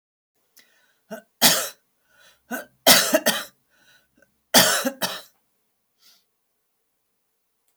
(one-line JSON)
{"three_cough_length": "7.8 s", "three_cough_amplitude": 32768, "three_cough_signal_mean_std_ratio": 0.29, "survey_phase": "alpha (2021-03-01 to 2021-08-12)", "age": "65+", "gender": "Female", "wearing_mask": "No", "symptom_none": true, "smoker_status": "Never smoked", "respiratory_condition_asthma": false, "respiratory_condition_other": false, "recruitment_source": "REACT", "submission_delay": "5 days", "covid_test_result": "Negative", "covid_test_method": "RT-qPCR"}